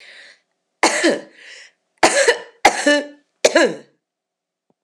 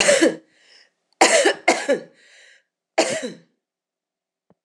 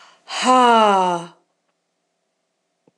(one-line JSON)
{"three_cough_length": "4.8 s", "three_cough_amplitude": 26028, "three_cough_signal_mean_std_ratio": 0.41, "cough_length": "4.6 s", "cough_amplitude": 26027, "cough_signal_mean_std_ratio": 0.4, "exhalation_length": "3.0 s", "exhalation_amplitude": 25602, "exhalation_signal_mean_std_ratio": 0.41, "survey_phase": "beta (2021-08-13 to 2022-03-07)", "age": "45-64", "gender": "Female", "wearing_mask": "No", "symptom_none": true, "smoker_status": "Never smoked", "respiratory_condition_asthma": false, "respiratory_condition_other": false, "recruitment_source": "REACT", "submission_delay": "2 days", "covid_test_result": "Negative", "covid_test_method": "RT-qPCR"}